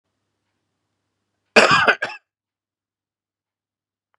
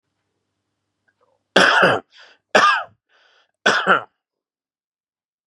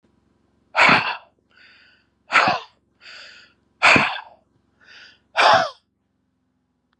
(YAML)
cough_length: 4.2 s
cough_amplitude: 32768
cough_signal_mean_std_ratio: 0.24
three_cough_length: 5.5 s
three_cough_amplitude: 32768
three_cough_signal_mean_std_ratio: 0.34
exhalation_length: 7.0 s
exhalation_amplitude: 30173
exhalation_signal_mean_std_ratio: 0.34
survey_phase: beta (2021-08-13 to 2022-03-07)
age: 18-44
gender: Male
wearing_mask: 'No'
symptom_none: true
smoker_status: Ex-smoker
respiratory_condition_asthma: false
respiratory_condition_other: false
recruitment_source: REACT
submission_delay: 1 day
covid_test_result: Negative
covid_test_method: RT-qPCR
influenza_a_test_result: Negative
influenza_b_test_result: Negative